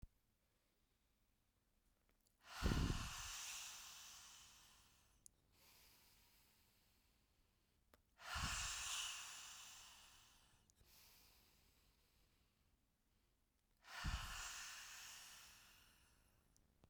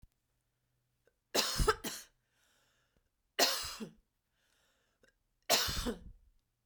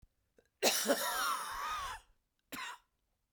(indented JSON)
{
  "exhalation_length": "16.9 s",
  "exhalation_amplitude": 1225,
  "exhalation_signal_mean_std_ratio": 0.41,
  "three_cough_length": "6.7 s",
  "three_cough_amplitude": 8123,
  "three_cough_signal_mean_std_ratio": 0.34,
  "cough_length": "3.3 s",
  "cough_amplitude": 5894,
  "cough_signal_mean_std_ratio": 0.54,
  "survey_phase": "beta (2021-08-13 to 2022-03-07)",
  "age": "45-64",
  "gender": "Female",
  "wearing_mask": "No",
  "symptom_cough_any": true,
  "symptom_shortness_of_breath": true,
  "symptom_headache": true,
  "symptom_change_to_sense_of_smell_or_taste": true,
  "symptom_loss_of_taste": true,
  "symptom_onset": "5 days",
  "smoker_status": "Never smoked",
  "respiratory_condition_asthma": false,
  "respiratory_condition_other": false,
  "recruitment_source": "Test and Trace",
  "submission_delay": "2 days",
  "covid_test_result": "Positive",
  "covid_test_method": "RT-qPCR"
}